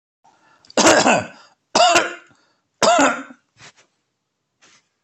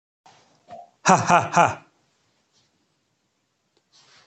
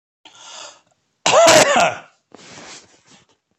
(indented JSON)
{
  "three_cough_length": "5.0 s",
  "three_cough_amplitude": 31854,
  "three_cough_signal_mean_std_ratio": 0.4,
  "exhalation_length": "4.3 s",
  "exhalation_amplitude": 27029,
  "exhalation_signal_mean_std_ratio": 0.26,
  "cough_length": "3.6 s",
  "cough_amplitude": 32768,
  "cough_signal_mean_std_ratio": 0.38,
  "survey_phase": "beta (2021-08-13 to 2022-03-07)",
  "age": "45-64",
  "gender": "Male",
  "wearing_mask": "No",
  "symptom_none": true,
  "smoker_status": "Ex-smoker",
  "respiratory_condition_asthma": false,
  "respiratory_condition_other": false,
  "recruitment_source": "REACT",
  "submission_delay": "2 days",
  "covid_test_result": "Negative",
  "covid_test_method": "RT-qPCR"
}